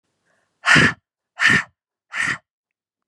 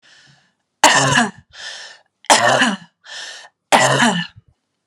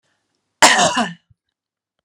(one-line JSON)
{"exhalation_length": "3.1 s", "exhalation_amplitude": 29200, "exhalation_signal_mean_std_ratio": 0.37, "three_cough_length": "4.9 s", "three_cough_amplitude": 32768, "three_cough_signal_mean_std_ratio": 0.47, "cough_length": "2.0 s", "cough_amplitude": 32768, "cough_signal_mean_std_ratio": 0.35, "survey_phase": "beta (2021-08-13 to 2022-03-07)", "age": "45-64", "gender": "Female", "wearing_mask": "No", "symptom_none": true, "smoker_status": "Never smoked", "respiratory_condition_asthma": false, "respiratory_condition_other": false, "recruitment_source": "REACT", "submission_delay": "1 day", "covid_test_result": "Negative", "covid_test_method": "RT-qPCR"}